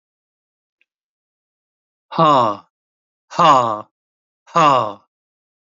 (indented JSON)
{
  "exhalation_length": "5.6 s",
  "exhalation_amplitude": 27611,
  "exhalation_signal_mean_std_ratio": 0.35,
  "survey_phase": "beta (2021-08-13 to 2022-03-07)",
  "age": "65+",
  "gender": "Male",
  "wearing_mask": "No",
  "symptom_fatigue": true,
  "symptom_fever_high_temperature": true,
  "symptom_onset": "3 days",
  "smoker_status": "Never smoked",
  "respiratory_condition_asthma": true,
  "respiratory_condition_other": true,
  "recruitment_source": "Test and Trace",
  "submission_delay": "2 days",
  "covid_test_result": "Positive",
  "covid_test_method": "RT-qPCR",
  "covid_ct_value": 14.7,
  "covid_ct_gene": "ORF1ab gene",
  "covid_ct_mean": 15.3,
  "covid_viral_load": "9900000 copies/ml",
  "covid_viral_load_category": "High viral load (>1M copies/ml)"
}